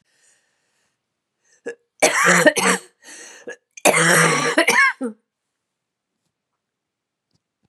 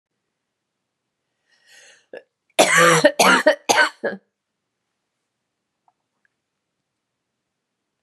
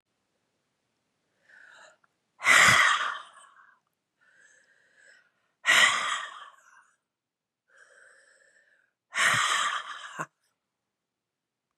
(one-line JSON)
{"three_cough_length": "7.7 s", "three_cough_amplitude": 32674, "three_cough_signal_mean_std_ratio": 0.4, "cough_length": "8.0 s", "cough_amplitude": 31701, "cough_signal_mean_std_ratio": 0.29, "exhalation_length": "11.8 s", "exhalation_amplitude": 16783, "exhalation_signal_mean_std_ratio": 0.32, "survey_phase": "beta (2021-08-13 to 2022-03-07)", "age": "45-64", "gender": "Female", "wearing_mask": "No", "symptom_cough_any": true, "symptom_runny_or_blocked_nose": true, "symptom_fatigue": true, "symptom_fever_high_temperature": true, "symptom_headache": true, "symptom_change_to_sense_of_smell_or_taste": true, "symptom_loss_of_taste": true, "symptom_onset": "2 days", "smoker_status": "Never smoked", "respiratory_condition_asthma": false, "respiratory_condition_other": false, "recruitment_source": "Test and Trace", "submission_delay": "2 days", "covid_test_result": "Positive", "covid_test_method": "RT-qPCR", "covid_ct_value": 17.6, "covid_ct_gene": "ORF1ab gene", "covid_ct_mean": 18.1, "covid_viral_load": "1100000 copies/ml", "covid_viral_load_category": "High viral load (>1M copies/ml)"}